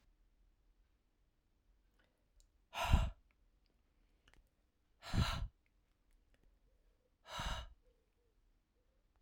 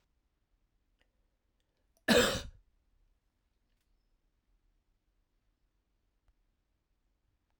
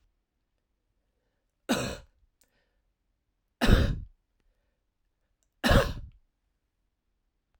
{"exhalation_length": "9.2 s", "exhalation_amplitude": 4503, "exhalation_signal_mean_std_ratio": 0.26, "cough_length": "7.6 s", "cough_amplitude": 7703, "cough_signal_mean_std_ratio": 0.17, "three_cough_length": "7.6 s", "three_cough_amplitude": 14981, "three_cough_signal_mean_std_ratio": 0.25, "survey_phase": "alpha (2021-03-01 to 2021-08-12)", "age": "45-64", "gender": "Male", "wearing_mask": "No", "symptom_none": true, "smoker_status": "Never smoked", "respiratory_condition_asthma": false, "respiratory_condition_other": false, "recruitment_source": "REACT", "submission_delay": "2 days", "covid_test_result": "Negative", "covid_test_method": "RT-qPCR"}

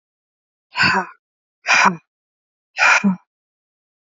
{"exhalation_length": "4.1 s", "exhalation_amplitude": 30175, "exhalation_signal_mean_std_ratio": 0.38, "survey_phase": "alpha (2021-03-01 to 2021-08-12)", "age": "18-44", "gender": "Female", "wearing_mask": "No", "symptom_cough_any": true, "symptom_new_continuous_cough": true, "symptom_shortness_of_breath": true, "symptom_fatigue": true, "symptom_fever_high_temperature": true, "symptom_headache": true, "symptom_change_to_sense_of_smell_or_taste": true, "symptom_loss_of_taste": true, "symptom_onset": "4 days", "smoker_status": "Ex-smoker", "respiratory_condition_asthma": true, "respiratory_condition_other": false, "recruitment_source": "Test and Trace", "submission_delay": "2 days", "covid_test_result": "Positive", "covid_test_method": "RT-qPCR"}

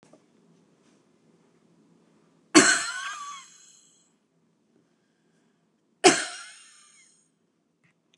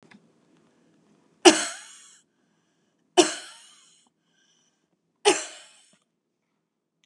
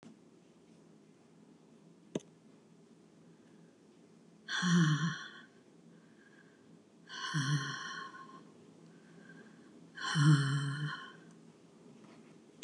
{"cough_length": "8.2 s", "cough_amplitude": 27003, "cough_signal_mean_std_ratio": 0.21, "three_cough_length": "7.1 s", "three_cough_amplitude": 31319, "three_cough_signal_mean_std_ratio": 0.19, "exhalation_length": "12.6 s", "exhalation_amplitude": 5302, "exhalation_signal_mean_std_ratio": 0.4, "survey_phase": "beta (2021-08-13 to 2022-03-07)", "age": "65+", "gender": "Female", "wearing_mask": "No", "symptom_none": true, "symptom_onset": "5 days", "smoker_status": "Ex-smoker", "respiratory_condition_asthma": true, "respiratory_condition_other": false, "recruitment_source": "REACT", "submission_delay": "1 day", "covid_test_result": "Negative", "covid_test_method": "RT-qPCR"}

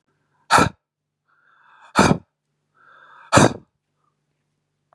{"exhalation_length": "4.9 s", "exhalation_amplitude": 32234, "exhalation_signal_mean_std_ratio": 0.26, "survey_phase": "beta (2021-08-13 to 2022-03-07)", "age": "18-44", "gender": "Male", "wearing_mask": "No", "symptom_none": true, "smoker_status": "Ex-smoker", "respiratory_condition_asthma": true, "respiratory_condition_other": false, "recruitment_source": "REACT", "submission_delay": "1 day", "covid_test_result": "Negative", "covid_test_method": "RT-qPCR", "influenza_a_test_result": "Negative", "influenza_b_test_result": "Negative"}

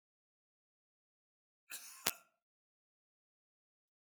{"cough_length": "4.1 s", "cough_amplitude": 13183, "cough_signal_mean_std_ratio": 0.11, "survey_phase": "beta (2021-08-13 to 2022-03-07)", "age": "65+", "gender": "Male", "wearing_mask": "No", "symptom_runny_or_blocked_nose": true, "smoker_status": "Ex-smoker", "respiratory_condition_asthma": false, "respiratory_condition_other": false, "recruitment_source": "REACT", "submission_delay": "1 day", "covid_test_result": "Negative", "covid_test_method": "RT-qPCR", "influenza_a_test_result": "Negative", "influenza_b_test_result": "Negative"}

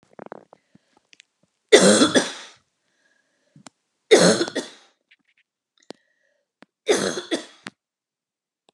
{"three_cough_length": "8.7 s", "three_cough_amplitude": 32768, "three_cough_signal_mean_std_ratio": 0.29, "survey_phase": "beta (2021-08-13 to 2022-03-07)", "age": "45-64", "gender": "Female", "wearing_mask": "No", "symptom_cough_any": true, "symptom_runny_or_blocked_nose": true, "symptom_fatigue": true, "symptom_headache": true, "symptom_onset": "3 days", "smoker_status": "Ex-smoker", "respiratory_condition_asthma": false, "respiratory_condition_other": false, "recruitment_source": "REACT", "submission_delay": "1 day", "covid_test_result": "Negative", "covid_test_method": "RT-qPCR"}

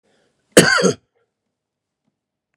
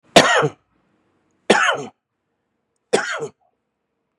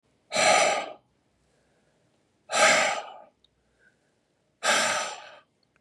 {"cough_length": "2.6 s", "cough_amplitude": 32768, "cough_signal_mean_std_ratio": 0.27, "three_cough_length": "4.2 s", "three_cough_amplitude": 32768, "three_cough_signal_mean_std_ratio": 0.33, "exhalation_length": "5.8 s", "exhalation_amplitude": 16034, "exhalation_signal_mean_std_ratio": 0.42, "survey_phase": "beta (2021-08-13 to 2022-03-07)", "age": "45-64", "gender": "Male", "wearing_mask": "No", "symptom_none": true, "smoker_status": "Ex-smoker", "respiratory_condition_asthma": false, "respiratory_condition_other": false, "recruitment_source": "REACT", "submission_delay": "1 day", "covid_test_result": "Negative", "covid_test_method": "RT-qPCR", "influenza_a_test_result": "Unknown/Void", "influenza_b_test_result": "Unknown/Void"}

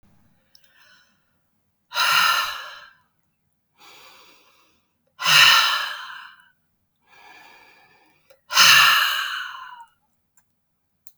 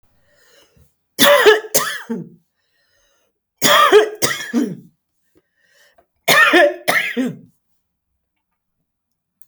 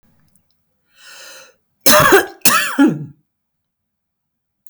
{"exhalation_length": "11.2 s", "exhalation_amplitude": 30074, "exhalation_signal_mean_std_ratio": 0.35, "three_cough_length": "9.5 s", "three_cough_amplitude": 32768, "three_cough_signal_mean_std_ratio": 0.4, "cough_length": "4.7 s", "cough_amplitude": 32768, "cough_signal_mean_std_ratio": 0.35, "survey_phase": "alpha (2021-03-01 to 2021-08-12)", "age": "45-64", "gender": "Female", "wearing_mask": "No", "symptom_none": true, "smoker_status": "Ex-smoker", "respiratory_condition_asthma": false, "respiratory_condition_other": false, "recruitment_source": "REACT", "submission_delay": "1 day", "covid_test_result": "Negative", "covid_test_method": "RT-qPCR"}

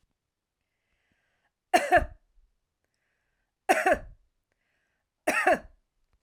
{"three_cough_length": "6.2 s", "three_cough_amplitude": 13835, "three_cough_signal_mean_std_ratio": 0.28, "survey_phase": "alpha (2021-03-01 to 2021-08-12)", "age": "45-64", "gender": "Female", "wearing_mask": "No", "symptom_none": true, "smoker_status": "Ex-smoker", "respiratory_condition_asthma": false, "respiratory_condition_other": false, "recruitment_source": "REACT", "submission_delay": "2 days", "covid_test_result": "Negative", "covid_test_method": "RT-qPCR"}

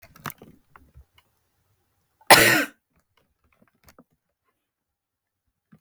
{"cough_length": "5.8 s", "cough_amplitude": 32768, "cough_signal_mean_std_ratio": 0.19, "survey_phase": "beta (2021-08-13 to 2022-03-07)", "age": "45-64", "gender": "Female", "wearing_mask": "No", "symptom_cough_any": true, "symptom_shortness_of_breath": true, "symptom_fatigue": true, "smoker_status": "Never smoked", "respiratory_condition_asthma": true, "respiratory_condition_other": false, "recruitment_source": "REACT", "submission_delay": "2 days", "covid_test_result": "Negative", "covid_test_method": "RT-qPCR", "influenza_a_test_result": "Negative", "influenza_b_test_result": "Negative"}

